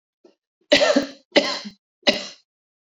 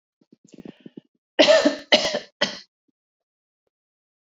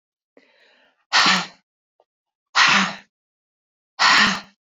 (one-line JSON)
{"three_cough_length": "3.0 s", "three_cough_amplitude": 28015, "three_cough_signal_mean_std_ratio": 0.36, "cough_length": "4.3 s", "cough_amplitude": 28572, "cough_signal_mean_std_ratio": 0.3, "exhalation_length": "4.8 s", "exhalation_amplitude": 27510, "exhalation_signal_mean_std_ratio": 0.39, "survey_phase": "beta (2021-08-13 to 2022-03-07)", "age": "45-64", "gender": "Female", "wearing_mask": "No", "symptom_runny_or_blocked_nose": true, "symptom_onset": "12 days", "smoker_status": "Ex-smoker", "respiratory_condition_asthma": true, "respiratory_condition_other": false, "recruitment_source": "REACT", "submission_delay": "1 day", "covid_test_result": "Negative", "covid_test_method": "RT-qPCR"}